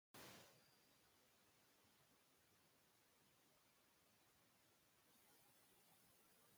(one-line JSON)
{"three_cough_length": "6.6 s", "three_cough_amplitude": 104, "three_cough_signal_mean_std_ratio": 0.78, "survey_phase": "beta (2021-08-13 to 2022-03-07)", "age": "65+", "gender": "Female", "wearing_mask": "No", "symptom_none": true, "smoker_status": "Ex-smoker", "respiratory_condition_asthma": false, "respiratory_condition_other": false, "recruitment_source": "Test and Trace", "submission_delay": "1 day", "covid_test_result": "Negative", "covid_test_method": "LFT"}